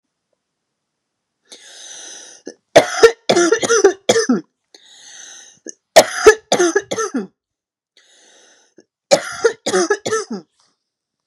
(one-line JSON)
{"three_cough_length": "11.3 s", "three_cough_amplitude": 32768, "three_cough_signal_mean_std_ratio": 0.36, "survey_phase": "beta (2021-08-13 to 2022-03-07)", "age": "45-64", "gender": "Female", "wearing_mask": "No", "symptom_fatigue": true, "smoker_status": "Never smoked", "respiratory_condition_asthma": false, "respiratory_condition_other": false, "recruitment_source": "REACT", "submission_delay": "1 day", "covid_test_result": "Negative", "covid_test_method": "RT-qPCR", "influenza_a_test_result": "Negative", "influenza_b_test_result": "Negative"}